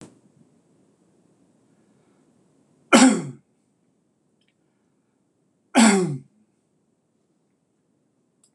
{"cough_length": "8.5 s", "cough_amplitude": 26027, "cough_signal_mean_std_ratio": 0.23, "survey_phase": "beta (2021-08-13 to 2022-03-07)", "age": "65+", "gender": "Male", "wearing_mask": "No", "symptom_none": true, "smoker_status": "Never smoked", "respiratory_condition_asthma": false, "respiratory_condition_other": false, "recruitment_source": "REACT", "submission_delay": "0 days", "covid_test_result": "Negative", "covid_test_method": "RT-qPCR"}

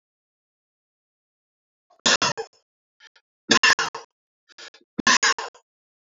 {"three_cough_length": "6.1 s", "three_cough_amplitude": 25655, "three_cough_signal_mean_std_ratio": 0.28, "survey_phase": "beta (2021-08-13 to 2022-03-07)", "age": "45-64", "gender": "Male", "wearing_mask": "No", "symptom_none": true, "smoker_status": "Never smoked", "respiratory_condition_asthma": false, "respiratory_condition_other": false, "recruitment_source": "REACT", "submission_delay": "1 day", "covid_test_result": "Negative", "covid_test_method": "RT-qPCR", "influenza_a_test_result": "Unknown/Void", "influenza_b_test_result": "Unknown/Void"}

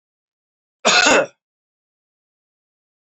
{"cough_length": "3.1 s", "cough_amplitude": 28623, "cough_signal_mean_std_ratio": 0.29, "survey_phase": "beta (2021-08-13 to 2022-03-07)", "age": "45-64", "gender": "Male", "wearing_mask": "No", "symptom_none": true, "smoker_status": "Never smoked", "respiratory_condition_asthma": false, "respiratory_condition_other": false, "recruitment_source": "REACT", "submission_delay": "2 days", "covid_test_result": "Negative", "covid_test_method": "RT-qPCR", "influenza_a_test_result": "Negative", "influenza_b_test_result": "Negative"}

